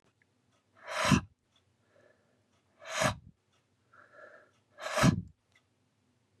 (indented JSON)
{
  "exhalation_length": "6.4 s",
  "exhalation_amplitude": 8320,
  "exhalation_signal_mean_std_ratio": 0.28,
  "survey_phase": "beta (2021-08-13 to 2022-03-07)",
  "age": "45-64",
  "gender": "Male",
  "wearing_mask": "No",
  "symptom_none": true,
  "smoker_status": "Ex-smoker",
  "respiratory_condition_asthma": false,
  "respiratory_condition_other": false,
  "recruitment_source": "REACT",
  "submission_delay": "2 days",
  "covid_test_result": "Negative",
  "covid_test_method": "RT-qPCR"
}